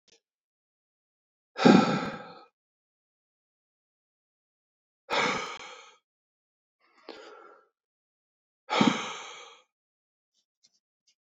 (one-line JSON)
{"exhalation_length": "11.3 s", "exhalation_amplitude": 18809, "exhalation_signal_mean_std_ratio": 0.24, "survey_phase": "beta (2021-08-13 to 2022-03-07)", "age": "18-44", "gender": "Male", "wearing_mask": "No", "symptom_fatigue": true, "symptom_change_to_sense_of_smell_or_taste": true, "symptom_other": true, "smoker_status": "Never smoked", "respiratory_condition_asthma": false, "respiratory_condition_other": false, "recruitment_source": "Test and Trace", "submission_delay": "2 days", "covid_test_result": "Positive", "covid_test_method": "LAMP"}